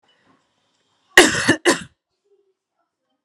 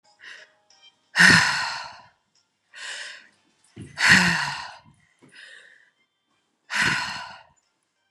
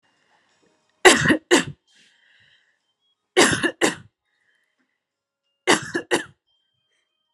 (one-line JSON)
{"cough_length": "3.2 s", "cough_amplitude": 32768, "cough_signal_mean_std_ratio": 0.26, "exhalation_length": "8.1 s", "exhalation_amplitude": 30962, "exhalation_signal_mean_std_ratio": 0.35, "three_cough_length": "7.3 s", "three_cough_amplitude": 32767, "three_cough_signal_mean_std_ratio": 0.29, "survey_phase": "alpha (2021-03-01 to 2021-08-12)", "age": "18-44", "gender": "Female", "wearing_mask": "No", "symptom_none": true, "smoker_status": "Never smoked", "respiratory_condition_asthma": false, "respiratory_condition_other": false, "recruitment_source": "Test and Trace", "submission_delay": "0 days", "covid_test_result": "Negative", "covid_test_method": "LFT"}